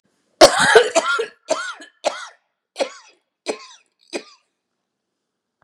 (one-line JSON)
{"cough_length": "5.6 s", "cough_amplitude": 32768, "cough_signal_mean_std_ratio": 0.31, "survey_phase": "beta (2021-08-13 to 2022-03-07)", "age": "65+", "gender": "Female", "wearing_mask": "No", "symptom_none": true, "smoker_status": "Ex-smoker", "respiratory_condition_asthma": false, "respiratory_condition_other": false, "recruitment_source": "REACT", "submission_delay": "1 day", "covid_test_result": "Negative", "covid_test_method": "RT-qPCR", "influenza_a_test_result": "Unknown/Void", "influenza_b_test_result": "Unknown/Void"}